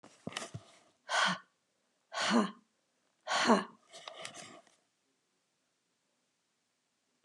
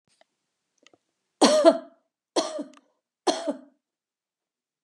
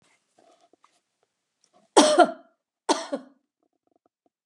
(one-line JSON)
{"exhalation_length": "7.2 s", "exhalation_amplitude": 8768, "exhalation_signal_mean_std_ratio": 0.32, "three_cough_length": "4.8 s", "three_cough_amplitude": 24066, "three_cough_signal_mean_std_ratio": 0.28, "cough_length": "4.5 s", "cough_amplitude": 29837, "cough_signal_mean_std_ratio": 0.24, "survey_phase": "beta (2021-08-13 to 2022-03-07)", "age": "45-64", "gender": "Female", "wearing_mask": "No", "symptom_none": true, "smoker_status": "Never smoked", "respiratory_condition_asthma": false, "respiratory_condition_other": false, "recruitment_source": "REACT", "submission_delay": "1 day", "covid_test_result": "Negative", "covid_test_method": "RT-qPCR", "influenza_a_test_result": "Negative", "influenza_b_test_result": "Negative"}